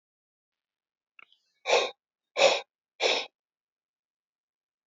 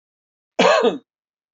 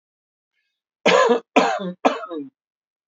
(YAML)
exhalation_length: 4.9 s
exhalation_amplitude: 13964
exhalation_signal_mean_std_ratio: 0.28
cough_length: 1.5 s
cough_amplitude: 23961
cough_signal_mean_std_ratio: 0.4
three_cough_length: 3.1 s
three_cough_amplitude: 27519
three_cough_signal_mean_std_ratio: 0.42
survey_phase: beta (2021-08-13 to 2022-03-07)
age: 45-64
gender: Male
wearing_mask: 'No'
symptom_none: true
smoker_status: Ex-smoker
respiratory_condition_asthma: false
respiratory_condition_other: true
recruitment_source: REACT
submission_delay: 11 days
covid_test_result: Negative
covid_test_method: RT-qPCR